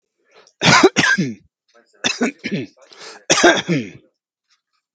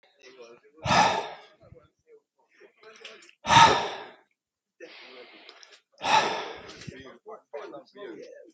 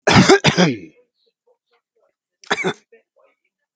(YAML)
three_cough_length: 4.9 s
three_cough_amplitude: 32768
three_cough_signal_mean_std_ratio: 0.42
exhalation_length: 8.5 s
exhalation_amplitude: 21266
exhalation_signal_mean_std_ratio: 0.33
cough_length: 3.8 s
cough_amplitude: 32768
cough_signal_mean_std_ratio: 0.34
survey_phase: beta (2021-08-13 to 2022-03-07)
age: 65+
gender: Male
wearing_mask: 'No'
symptom_none: true
smoker_status: Ex-smoker
respiratory_condition_asthma: false
respiratory_condition_other: false
recruitment_source: REACT
submission_delay: 1 day
covid_test_result: Negative
covid_test_method: RT-qPCR
influenza_a_test_result: Negative
influenza_b_test_result: Negative